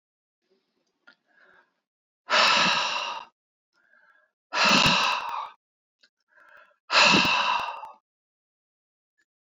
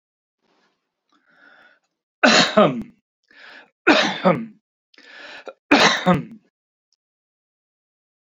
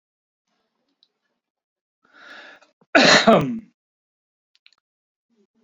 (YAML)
exhalation_length: 9.5 s
exhalation_amplitude: 18071
exhalation_signal_mean_std_ratio: 0.41
three_cough_length: 8.3 s
three_cough_amplitude: 31387
three_cough_signal_mean_std_ratio: 0.33
cough_length: 5.6 s
cough_amplitude: 29317
cough_signal_mean_std_ratio: 0.25
survey_phase: beta (2021-08-13 to 2022-03-07)
age: 65+
gender: Male
wearing_mask: 'No'
symptom_none: true
smoker_status: Ex-smoker
respiratory_condition_asthma: false
respiratory_condition_other: false
recruitment_source: REACT
submission_delay: 1 day
covid_test_result: Negative
covid_test_method: RT-qPCR